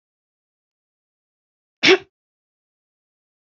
{"cough_length": "3.6 s", "cough_amplitude": 28979, "cough_signal_mean_std_ratio": 0.16, "survey_phase": "beta (2021-08-13 to 2022-03-07)", "age": "65+", "gender": "Female", "wearing_mask": "No", "symptom_none": true, "smoker_status": "Never smoked", "respiratory_condition_asthma": false, "respiratory_condition_other": false, "recruitment_source": "REACT", "submission_delay": "2 days", "covid_test_result": "Negative", "covid_test_method": "RT-qPCR", "influenza_a_test_result": "Negative", "influenza_b_test_result": "Negative"}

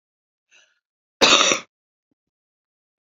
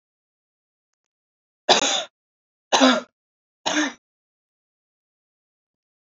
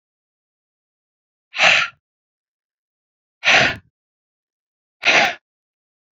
{"cough_length": "3.1 s", "cough_amplitude": 32768, "cough_signal_mean_std_ratio": 0.27, "three_cough_length": "6.1 s", "three_cough_amplitude": 26906, "three_cough_signal_mean_std_ratio": 0.27, "exhalation_length": "6.1 s", "exhalation_amplitude": 32767, "exhalation_signal_mean_std_ratio": 0.29, "survey_phase": "alpha (2021-03-01 to 2021-08-12)", "age": "45-64", "gender": "Female", "wearing_mask": "No", "symptom_none": true, "smoker_status": "Never smoked", "respiratory_condition_asthma": true, "respiratory_condition_other": false, "recruitment_source": "REACT", "submission_delay": "2 days", "covid_test_result": "Negative", "covid_test_method": "RT-qPCR"}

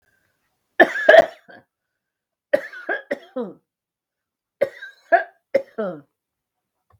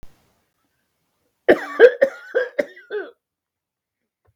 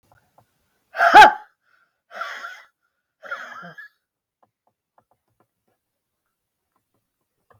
{"three_cough_length": "7.0 s", "three_cough_amplitude": 32768, "three_cough_signal_mean_std_ratio": 0.26, "cough_length": "4.4 s", "cough_amplitude": 32768, "cough_signal_mean_std_ratio": 0.26, "exhalation_length": "7.6 s", "exhalation_amplitude": 32768, "exhalation_signal_mean_std_ratio": 0.18, "survey_phase": "beta (2021-08-13 to 2022-03-07)", "age": "45-64", "gender": "Female", "wearing_mask": "No", "symptom_none": true, "smoker_status": "Never smoked", "respiratory_condition_asthma": false, "respiratory_condition_other": true, "recruitment_source": "REACT", "submission_delay": "1 day", "covid_test_result": "Negative", "covid_test_method": "RT-qPCR", "influenza_a_test_result": "Negative", "influenza_b_test_result": "Negative"}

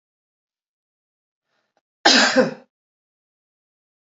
{"cough_length": "4.2 s", "cough_amplitude": 28977, "cough_signal_mean_std_ratio": 0.25, "survey_phase": "alpha (2021-03-01 to 2021-08-12)", "age": "45-64", "gender": "Female", "wearing_mask": "No", "symptom_none": true, "smoker_status": "Never smoked", "respiratory_condition_asthma": false, "respiratory_condition_other": false, "recruitment_source": "REACT", "submission_delay": "1 day", "covid_test_result": "Negative", "covid_test_method": "RT-qPCR"}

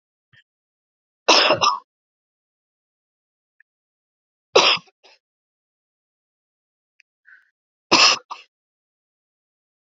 {"three_cough_length": "9.9 s", "three_cough_amplitude": 32607, "three_cough_signal_mean_std_ratio": 0.24, "survey_phase": "beta (2021-08-13 to 2022-03-07)", "age": "45-64", "gender": "Female", "wearing_mask": "No", "symptom_cough_any": true, "symptom_new_continuous_cough": true, "symptom_runny_or_blocked_nose": true, "symptom_shortness_of_breath": true, "symptom_sore_throat": true, "symptom_fatigue": true, "symptom_onset": "4 days", "smoker_status": "Never smoked", "respiratory_condition_asthma": false, "respiratory_condition_other": false, "recruitment_source": "Test and Trace", "submission_delay": "1 day", "covid_test_result": "Negative", "covid_test_method": "RT-qPCR"}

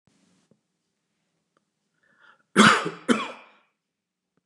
{"cough_length": "4.5 s", "cough_amplitude": 24975, "cough_signal_mean_std_ratio": 0.24, "survey_phase": "beta (2021-08-13 to 2022-03-07)", "age": "65+", "gender": "Male", "wearing_mask": "No", "symptom_none": true, "smoker_status": "Ex-smoker", "respiratory_condition_asthma": false, "respiratory_condition_other": false, "recruitment_source": "REACT", "submission_delay": "0 days", "covid_test_result": "Negative", "covid_test_method": "RT-qPCR", "influenza_a_test_result": "Negative", "influenza_b_test_result": "Negative"}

